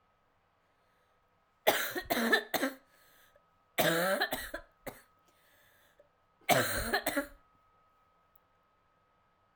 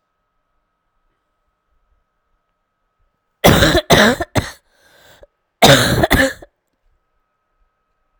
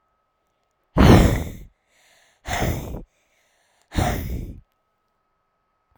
{"three_cough_length": "9.6 s", "three_cough_amplitude": 9029, "three_cough_signal_mean_std_ratio": 0.38, "cough_length": "8.2 s", "cough_amplitude": 32768, "cough_signal_mean_std_ratio": 0.32, "exhalation_length": "6.0 s", "exhalation_amplitude": 32768, "exhalation_signal_mean_std_ratio": 0.33, "survey_phase": "beta (2021-08-13 to 2022-03-07)", "age": "18-44", "gender": "Female", "wearing_mask": "No", "symptom_cough_any": true, "symptom_runny_or_blocked_nose": true, "symptom_shortness_of_breath": true, "symptom_sore_throat": true, "symptom_fatigue": true, "symptom_fever_high_temperature": true, "symptom_headache": true, "symptom_change_to_sense_of_smell_or_taste": true, "symptom_loss_of_taste": true, "symptom_onset": "5 days", "smoker_status": "Never smoked", "respiratory_condition_asthma": false, "respiratory_condition_other": false, "recruitment_source": "Test and Trace", "submission_delay": "4 days", "covid_test_result": "Positive", "covid_test_method": "RT-qPCR", "covid_ct_value": 13.9, "covid_ct_gene": "ORF1ab gene", "covid_ct_mean": 14.9, "covid_viral_load": "13000000 copies/ml", "covid_viral_load_category": "High viral load (>1M copies/ml)"}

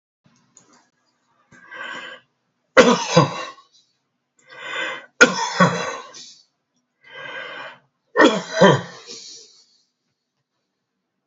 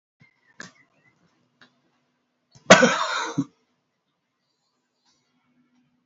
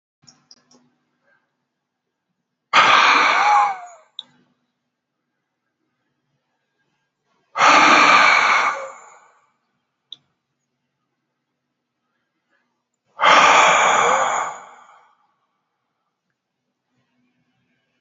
{"three_cough_length": "11.3 s", "three_cough_amplitude": 30081, "three_cough_signal_mean_std_ratio": 0.32, "cough_length": "6.1 s", "cough_amplitude": 29762, "cough_signal_mean_std_ratio": 0.2, "exhalation_length": "18.0 s", "exhalation_amplitude": 32736, "exhalation_signal_mean_std_ratio": 0.37, "survey_phase": "alpha (2021-03-01 to 2021-08-12)", "age": "65+", "gender": "Male", "wearing_mask": "No", "symptom_none": true, "smoker_status": "Ex-smoker", "respiratory_condition_asthma": false, "respiratory_condition_other": true, "recruitment_source": "REACT", "submission_delay": "2 days", "covid_test_result": "Negative", "covid_test_method": "RT-qPCR"}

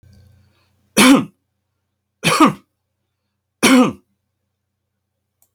{"three_cough_length": "5.5 s", "three_cough_amplitude": 32767, "three_cough_signal_mean_std_ratio": 0.31, "survey_phase": "alpha (2021-03-01 to 2021-08-12)", "age": "45-64", "gender": "Male", "wearing_mask": "No", "symptom_none": true, "smoker_status": "Never smoked", "respiratory_condition_asthma": false, "respiratory_condition_other": false, "recruitment_source": "REACT", "submission_delay": "1 day", "covid_test_result": "Negative", "covid_test_method": "RT-qPCR"}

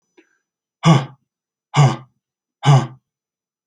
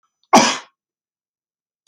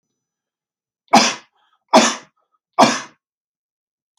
{"exhalation_length": "3.7 s", "exhalation_amplitude": 28952, "exhalation_signal_mean_std_ratio": 0.33, "cough_length": "1.9 s", "cough_amplitude": 30485, "cough_signal_mean_std_ratio": 0.26, "three_cough_length": "4.2 s", "three_cough_amplitude": 32243, "three_cough_signal_mean_std_ratio": 0.29, "survey_phase": "beta (2021-08-13 to 2022-03-07)", "age": "45-64", "gender": "Male", "wearing_mask": "No", "symptom_none": true, "smoker_status": "Ex-smoker", "respiratory_condition_asthma": false, "respiratory_condition_other": false, "recruitment_source": "REACT", "submission_delay": "1 day", "covid_test_result": "Negative", "covid_test_method": "RT-qPCR", "influenza_a_test_result": "Negative", "influenza_b_test_result": "Negative"}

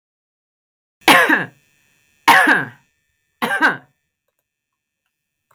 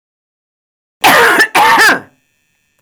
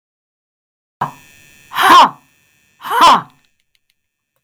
{"three_cough_length": "5.5 s", "three_cough_amplitude": 32768, "three_cough_signal_mean_std_ratio": 0.34, "cough_length": "2.8 s", "cough_amplitude": 32768, "cough_signal_mean_std_ratio": 0.54, "exhalation_length": "4.4 s", "exhalation_amplitude": 32768, "exhalation_signal_mean_std_ratio": 0.34, "survey_phase": "beta (2021-08-13 to 2022-03-07)", "age": "65+", "gender": "Female", "wearing_mask": "No", "symptom_cough_any": true, "smoker_status": "Never smoked", "respiratory_condition_asthma": false, "respiratory_condition_other": false, "recruitment_source": "REACT", "submission_delay": "0 days", "covid_test_result": "Negative", "covid_test_method": "RT-qPCR"}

